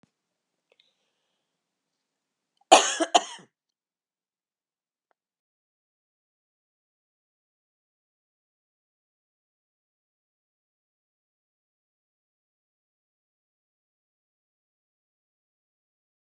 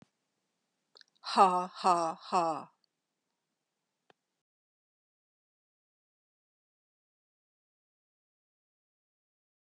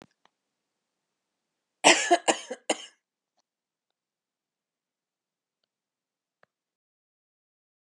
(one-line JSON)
{"cough_length": "16.3 s", "cough_amplitude": 31301, "cough_signal_mean_std_ratio": 0.1, "exhalation_length": "9.7 s", "exhalation_amplitude": 11623, "exhalation_signal_mean_std_ratio": 0.21, "three_cough_length": "7.8 s", "three_cough_amplitude": 24233, "three_cough_signal_mean_std_ratio": 0.17, "survey_phase": "beta (2021-08-13 to 2022-03-07)", "age": "65+", "gender": "Female", "wearing_mask": "No", "symptom_cough_any": true, "symptom_shortness_of_breath": true, "symptom_fatigue": true, "symptom_headache": true, "symptom_onset": "2 days", "smoker_status": "Never smoked", "respiratory_condition_asthma": false, "respiratory_condition_other": false, "recruitment_source": "Test and Trace", "submission_delay": "1 day", "covid_test_result": "Positive", "covid_test_method": "RT-qPCR", "covid_ct_value": 21.7, "covid_ct_gene": "ORF1ab gene", "covid_ct_mean": 22.0, "covid_viral_load": "61000 copies/ml", "covid_viral_load_category": "Low viral load (10K-1M copies/ml)"}